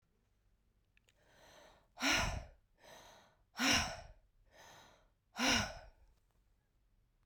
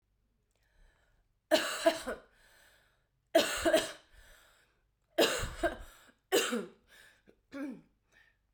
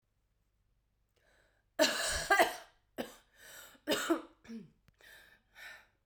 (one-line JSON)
{"exhalation_length": "7.3 s", "exhalation_amplitude": 3498, "exhalation_signal_mean_std_ratio": 0.35, "three_cough_length": "8.5 s", "three_cough_amplitude": 8300, "three_cough_signal_mean_std_ratio": 0.36, "cough_length": "6.1 s", "cough_amplitude": 8907, "cough_signal_mean_std_ratio": 0.34, "survey_phase": "beta (2021-08-13 to 2022-03-07)", "age": "18-44", "gender": "Female", "wearing_mask": "Yes", "symptom_cough_any": true, "symptom_runny_or_blocked_nose": true, "symptom_shortness_of_breath": true, "symptom_sore_throat": true, "symptom_fatigue": true, "symptom_fever_high_temperature": true, "symptom_headache": true, "symptom_other": true, "smoker_status": "Never smoked", "respiratory_condition_asthma": false, "respiratory_condition_other": false, "recruitment_source": "Test and Trace", "submission_delay": "-1 day", "covid_test_result": "Positive", "covid_test_method": "LFT"}